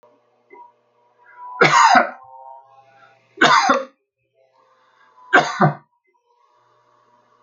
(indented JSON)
{
  "three_cough_length": "7.4 s",
  "three_cough_amplitude": 29648,
  "three_cough_signal_mean_std_ratio": 0.34,
  "survey_phase": "alpha (2021-03-01 to 2021-08-12)",
  "age": "65+",
  "gender": "Male",
  "wearing_mask": "No",
  "symptom_none": true,
  "smoker_status": "Never smoked",
  "respiratory_condition_asthma": false,
  "respiratory_condition_other": false,
  "recruitment_source": "REACT",
  "submission_delay": "2 days",
  "covid_test_result": "Negative",
  "covid_test_method": "RT-qPCR"
}